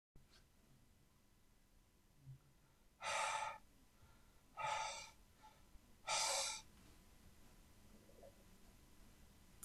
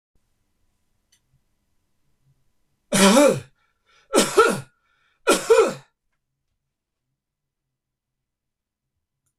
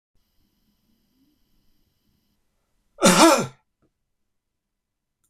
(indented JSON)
{
  "exhalation_length": "9.6 s",
  "exhalation_amplitude": 1552,
  "exhalation_signal_mean_std_ratio": 0.44,
  "three_cough_length": "9.4 s",
  "three_cough_amplitude": 25928,
  "three_cough_signal_mean_std_ratio": 0.28,
  "cough_length": "5.3 s",
  "cough_amplitude": 26028,
  "cough_signal_mean_std_ratio": 0.22,
  "survey_phase": "beta (2021-08-13 to 2022-03-07)",
  "age": "65+",
  "gender": "Male",
  "wearing_mask": "No",
  "symptom_none": true,
  "symptom_onset": "4 days",
  "smoker_status": "Never smoked",
  "respiratory_condition_asthma": false,
  "respiratory_condition_other": false,
  "recruitment_source": "REACT",
  "submission_delay": "2 days",
  "covid_test_result": "Negative",
  "covid_test_method": "RT-qPCR",
  "influenza_a_test_result": "Negative",
  "influenza_b_test_result": "Negative"
}